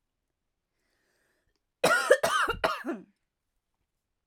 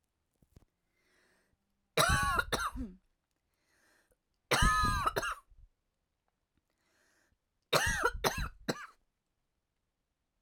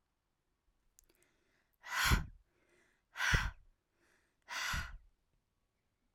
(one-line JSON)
{"cough_length": "4.3 s", "cough_amplitude": 17290, "cough_signal_mean_std_ratio": 0.34, "three_cough_length": "10.4 s", "three_cough_amplitude": 9831, "three_cough_signal_mean_std_ratio": 0.37, "exhalation_length": "6.1 s", "exhalation_amplitude": 5024, "exhalation_signal_mean_std_ratio": 0.32, "survey_phase": "alpha (2021-03-01 to 2021-08-12)", "age": "18-44", "gender": "Female", "wearing_mask": "No", "symptom_cough_any": true, "symptom_fatigue": true, "symptom_headache": true, "symptom_onset": "12 days", "smoker_status": "Never smoked", "respiratory_condition_asthma": false, "respiratory_condition_other": false, "recruitment_source": "REACT", "submission_delay": "1 day", "covid_test_result": "Negative", "covid_test_method": "RT-qPCR"}